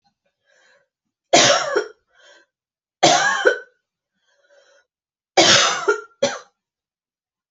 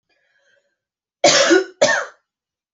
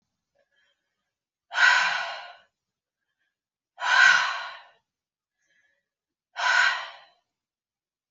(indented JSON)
{
  "three_cough_length": "7.5 s",
  "three_cough_amplitude": 32767,
  "three_cough_signal_mean_std_ratio": 0.37,
  "cough_length": "2.7 s",
  "cough_amplitude": 30560,
  "cough_signal_mean_std_ratio": 0.39,
  "exhalation_length": "8.1 s",
  "exhalation_amplitude": 19217,
  "exhalation_signal_mean_std_ratio": 0.35,
  "survey_phase": "beta (2021-08-13 to 2022-03-07)",
  "age": "18-44",
  "gender": "Female",
  "wearing_mask": "No",
  "symptom_none": true,
  "smoker_status": "Never smoked",
  "respiratory_condition_asthma": false,
  "respiratory_condition_other": false,
  "recruitment_source": "REACT",
  "submission_delay": "1 day",
  "covid_test_result": "Negative",
  "covid_test_method": "RT-qPCR"
}